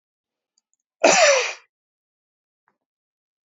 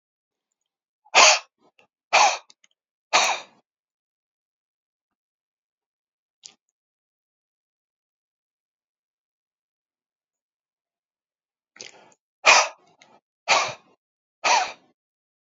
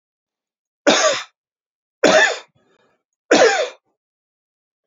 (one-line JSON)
{"cough_length": "3.5 s", "cough_amplitude": 27265, "cough_signal_mean_std_ratio": 0.29, "exhalation_length": "15.4 s", "exhalation_amplitude": 32248, "exhalation_signal_mean_std_ratio": 0.22, "three_cough_length": "4.9 s", "three_cough_amplitude": 29377, "three_cough_signal_mean_std_ratio": 0.36, "survey_phase": "alpha (2021-03-01 to 2021-08-12)", "age": "65+", "gender": "Male", "wearing_mask": "No", "symptom_cough_any": true, "smoker_status": "Ex-smoker", "respiratory_condition_asthma": true, "respiratory_condition_other": false, "recruitment_source": "REACT", "submission_delay": "2 days", "covid_test_result": "Negative", "covid_test_method": "RT-qPCR"}